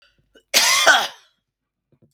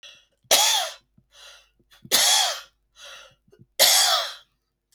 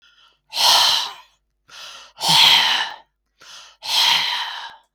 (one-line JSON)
{"cough_length": "2.1 s", "cough_amplitude": 32768, "cough_signal_mean_std_ratio": 0.4, "three_cough_length": "4.9 s", "three_cough_amplitude": 29886, "three_cough_signal_mean_std_ratio": 0.44, "exhalation_length": "4.9 s", "exhalation_amplitude": 32735, "exhalation_signal_mean_std_ratio": 0.53, "survey_phase": "beta (2021-08-13 to 2022-03-07)", "age": "65+", "gender": "Male", "wearing_mask": "No", "symptom_none": true, "smoker_status": "Never smoked", "respiratory_condition_asthma": false, "respiratory_condition_other": false, "recruitment_source": "REACT", "submission_delay": "1 day", "covid_test_result": "Negative", "covid_test_method": "RT-qPCR"}